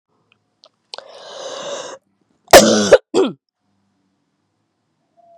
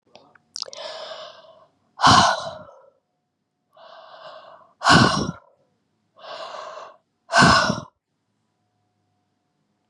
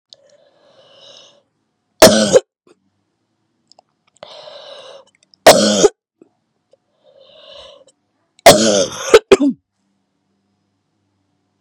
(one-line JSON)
{"cough_length": "5.4 s", "cough_amplitude": 32768, "cough_signal_mean_std_ratio": 0.27, "exhalation_length": "9.9 s", "exhalation_amplitude": 30845, "exhalation_signal_mean_std_ratio": 0.32, "three_cough_length": "11.6 s", "three_cough_amplitude": 32768, "three_cough_signal_mean_std_ratio": 0.28, "survey_phase": "beta (2021-08-13 to 2022-03-07)", "age": "45-64", "gender": "Female", "wearing_mask": "No", "symptom_cough_any": true, "symptom_runny_or_blocked_nose": true, "symptom_shortness_of_breath": true, "symptom_sore_throat": true, "symptom_fatigue": true, "symptom_headache": true, "symptom_change_to_sense_of_smell_or_taste": true, "smoker_status": "Never smoked", "respiratory_condition_asthma": false, "respiratory_condition_other": true, "recruitment_source": "Test and Trace", "submission_delay": "2 days", "covid_test_result": "Positive", "covid_test_method": "LFT"}